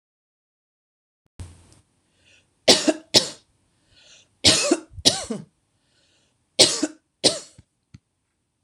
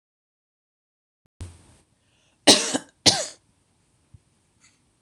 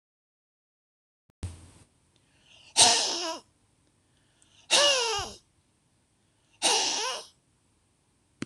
{"three_cough_length": "8.6 s", "three_cough_amplitude": 26028, "three_cough_signal_mean_std_ratio": 0.27, "cough_length": "5.0 s", "cough_amplitude": 26028, "cough_signal_mean_std_ratio": 0.21, "exhalation_length": "8.5 s", "exhalation_amplitude": 21464, "exhalation_signal_mean_std_ratio": 0.34, "survey_phase": "beta (2021-08-13 to 2022-03-07)", "age": "45-64", "gender": "Female", "wearing_mask": "No", "symptom_none": true, "smoker_status": "Never smoked", "respiratory_condition_asthma": false, "respiratory_condition_other": false, "recruitment_source": "REACT", "submission_delay": "1 day", "covid_test_result": "Negative", "covid_test_method": "RT-qPCR", "influenza_a_test_result": "Negative", "influenza_b_test_result": "Negative"}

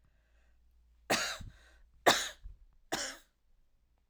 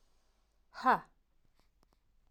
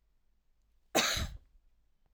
{"three_cough_length": "4.1 s", "three_cough_amplitude": 9542, "three_cough_signal_mean_std_ratio": 0.31, "exhalation_length": "2.3 s", "exhalation_amplitude": 6582, "exhalation_signal_mean_std_ratio": 0.21, "cough_length": "2.1 s", "cough_amplitude": 7077, "cough_signal_mean_std_ratio": 0.34, "survey_phase": "beta (2021-08-13 to 2022-03-07)", "age": "18-44", "gender": "Female", "wearing_mask": "No", "symptom_none": true, "smoker_status": "Never smoked", "respiratory_condition_asthma": false, "respiratory_condition_other": false, "recruitment_source": "REACT", "submission_delay": "1 day", "covid_test_result": "Negative", "covid_test_method": "RT-qPCR"}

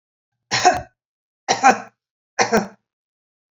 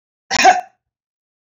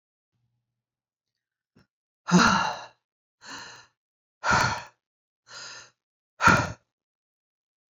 {"three_cough_length": "3.6 s", "three_cough_amplitude": 32552, "three_cough_signal_mean_std_ratio": 0.34, "cough_length": "1.5 s", "cough_amplitude": 28421, "cough_signal_mean_std_ratio": 0.32, "exhalation_length": "7.9 s", "exhalation_amplitude": 19732, "exhalation_signal_mean_std_ratio": 0.3, "survey_phase": "beta (2021-08-13 to 2022-03-07)", "age": "45-64", "gender": "Female", "wearing_mask": "No", "symptom_none": true, "smoker_status": "Never smoked", "respiratory_condition_asthma": false, "respiratory_condition_other": false, "recruitment_source": "REACT", "submission_delay": "15 days", "covid_test_result": "Negative", "covid_test_method": "RT-qPCR"}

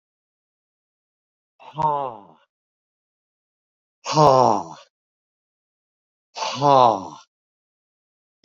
{"exhalation_length": "8.4 s", "exhalation_amplitude": 29000, "exhalation_signal_mean_std_ratio": 0.29, "survey_phase": "beta (2021-08-13 to 2022-03-07)", "age": "65+", "gender": "Male", "wearing_mask": "No", "symptom_none": true, "smoker_status": "Ex-smoker", "respiratory_condition_asthma": false, "respiratory_condition_other": false, "recruitment_source": "REACT", "submission_delay": "1 day", "covid_test_result": "Negative", "covid_test_method": "RT-qPCR"}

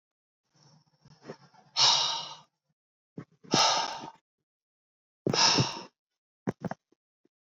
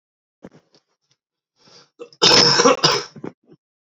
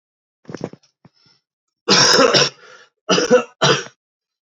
{"exhalation_length": "7.4 s", "exhalation_amplitude": 10712, "exhalation_signal_mean_std_ratio": 0.36, "cough_length": "3.9 s", "cough_amplitude": 32768, "cough_signal_mean_std_ratio": 0.36, "three_cough_length": "4.5 s", "three_cough_amplitude": 32767, "three_cough_signal_mean_std_ratio": 0.42, "survey_phase": "alpha (2021-03-01 to 2021-08-12)", "age": "18-44", "gender": "Male", "wearing_mask": "No", "symptom_cough_any": true, "symptom_fatigue": true, "symptom_headache": true, "smoker_status": "Never smoked", "recruitment_source": "Test and Trace", "submission_delay": "3 days", "covid_test_result": "Positive", "covid_test_method": "LFT"}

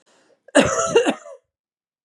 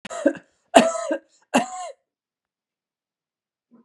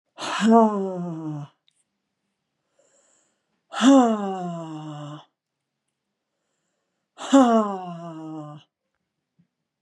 {"cough_length": "2.0 s", "cough_amplitude": 30370, "cough_signal_mean_std_ratio": 0.41, "three_cough_length": "3.8 s", "three_cough_amplitude": 32768, "three_cough_signal_mean_std_ratio": 0.29, "exhalation_length": "9.8 s", "exhalation_amplitude": 23646, "exhalation_signal_mean_std_ratio": 0.36, "survey_phase": "beta (2021-08-13 to 2022-03-07)", "age": "45-64", "gender": "Female", "wearing_mask": "No", "symptom_none": true, "symptom_onset": "8 days", "smoker_status": "Never smoked", "respiratory_condition_asthma": true, "respiratory_condition_other": false, "recruitment_source": "REACT", "submission_delay": "4 days", "covid_test_result": "Negative", "covid_test_method": "RT-qPCR", "influenza_a_test_result": "Negative", "influenza_b_test_result": "Negative"}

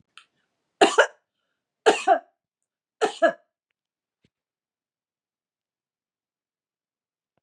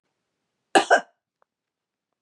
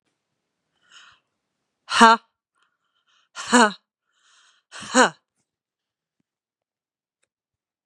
{"three_cough_length": "7.4 s", "three_cough_amplitude": 25612, "three_cough_signal_mean_std_ratio": 0.22, "cough_length": "2.2 s", "cough_amplitude": 24338, "cough_signal_mean_std_ratio": 0.22, "exhalation_length": "7.9 s", "exhalation_amplitude": 32767, "exhalation_signal_mean_std_ratio": 0.2, "survey_phase": "beta (2021-08-13 to 2022-03-07)", "age": "45-64", "gender": "Female", "wearing_mask": "No", "symptom_cough_any": true, "symptom_runny_or_blocked_nose": true, "symptom_shortness_of_breath": true, "symptom_change_to_sense_of_smell_or_taste": true, "symptom_loss_of_taste": true, "smoker_status": "Ex-smoker", "respiratory_condition_asthma": false, "respiratory_condition_other": false, "recruitment_source": "REACT", "submission_delay": "1 day", "covid_test_result": "Negative", "covid_test_method": "RT-qPCR", "influenza_a_test_result": "Negative", "influenza_b_test_result": "Negative"}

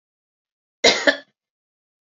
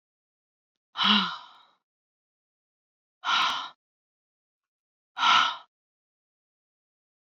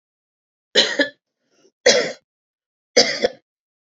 {"cough_length": "2.1 s", "cough_amplitude": 29789, "cough_signal_mean_std_ratio": 0.25, "exhalation_length": "7.3 s", "exhalation_amplitude": 14246, "exhalation_signal_mean_std_ratio": 0.3, "three_cough_length": "3.9 s", "three_cough_amplitude": 31923, "three_cough_signal_mean_std_ratio": 0.33, "survey_phase": "beta (2021-08-13 to 2022-03-07)", "age": "45-64", "gender": "Female", "wearing_mask": "No", "symptom_none": true, "smoker_status": "Current smoker (11 or more cigarettes per day)", "respiratory_condition_asthma": false, "respiratory_condition_other": false, "recruitment_source": "REACT", "submission_delay": "1 day", "covid_test_result": "Negative", "covid_test_method": "RT-qPCR", "influenza_a_test_result": "Negative", "influenza_b_test_result": "Negative"}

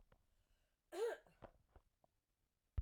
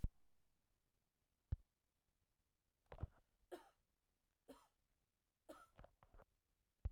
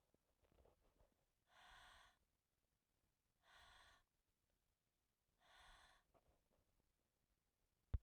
{"cough_length": "2.8 s", "cough_amplitude": 937, "cough_signal_mean_std_ratio": 0.29, "three_cough_length": "6.9 s", "three_cough_amplitude": 1242, "three_cough_signal_mean_std_ratio": 0.19, "exhalation_length": "8.0 s", "exhalation_amplitude": 761, "exhalation_signal_mean_std_ratio": 0.18, "survey_phase": "beta (2021-08-13 to 2022-03-07)", "age": "45-64", "gender": "Female", "wearing_mask": "No", "symptom_cough_any": true, "symptom_runny_or_blocked_nose": true, "symptom_headache": true, "smoker_status": "Never smoked", "respiratory_condition_asthma": true, "respiratory_condition_other": false, "recruitment_source": "Test and Trace", "submission_delay": "3 days", "covid_test_result": "Positive", "covid_test_method": "RT-qPCR"}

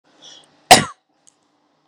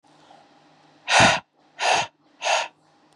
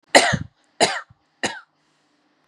{"cough_length": "1.9 s", "cough_amplitude": 32768, "cough_signal_mean_std_ratio": 0.2, "exhalation_length": "3.2 s", "exhalation_amplitude": 23206, "exhalation_signal_mean_std_ratio": 0.4, "three_cough_length": "2.5 s", "three_cough_amplitude": 32768, "three_cough_signal_mean_std_ratio": 0.31, "survey_phase": "beta (2021-08-13 to 2022-03-07)", "age": "18-44", "gender": "Female", "wearing_mask": "No", "symptom_none": true, "smoker_status": "Never smoked", "respiratory_condition_asthma": false, "respiratory_condition_other": false, "recruitment_source": "REACT", "submission_delay": "21 days", "covid_test_result": "Negative", "covid_test_method": "RT-qPCR", "influenza_a_test_result": "Negative", "influenza_b_test_result": "Negative"}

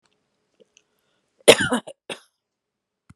{"cough_length": "3.2 s", "cough_amplitude": 32768, "cough_signal_mean_std_ratio": 0.19, "survey_phase": "beta (2021-08-13 to 2022-03-07)", "age": "65+", "gender": "Female", "wearing_mask": "No", "symptom_abdominal_pain": true, "symptom_headache": true, "symptom_onset": "11 days", "smoker_status": "Ex-smoker", "respiratory_condition_asthma": false, "respiratory_condition_other": false, "recruitment_source": "REACT", "submission_delay": "6 days", "covid_test_result": "Negative", "covid_test_method": "RT-qPCR"}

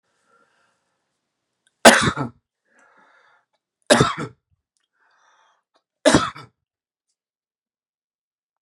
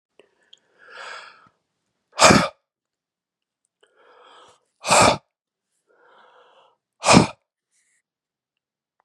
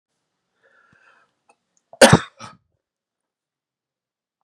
{"three_cough_length": "8.6 s", "three_cough_amplitude": 32768, "three_cough_signal_mean_std_ratio": 0.21, "exhalation_length": "9.0 s", "exhalation_amplitude": 32767, "exhalation_signal_mean_std_ratio": 0.23, "cough_length": "4.4 s", "cough_amplitude": 32768, "cough_signal_mean_std_ratio": 0.15, "survey_phase": "beta (2021-08-13 to 2022-03-07)", "age": "45-64", "gender": "Male", "wearing_mask": "No", "symptom_none": true, "smoker_status": "Ex-smoker", "respiratory_condition_asthma": false, "respiratory_condition_other": false, "recruitment_source": "REACT", "submission_delay": "4 days", "covid_test_result": "Negative", "covid_test_method": "RT-qPCR", "influenza_a_test_result": "Negative", "influenza_b_test_result": "Negative"}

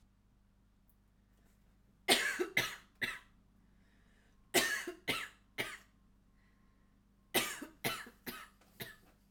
{"three_cough_length": "9.3 s", "three_cough_amplitude": 6947, "three_cough_signal_mean_std_ratio": 0.36, "survey_phase": "alpha (2021-03-01 to 2021-08-12)", "age": "18-44", "gender": "Female", "wearing_mask": "No", "symptom_fatigue": true, "smoker_status": "Never smoked", "respiratory_condition_asthma": false, "respiratory_condition_other": false, "recruitment_source": "REACT", "submission_delay": "32 days", "covid_test_result": "Negative", "covid_test_method": "RT-qPCR"}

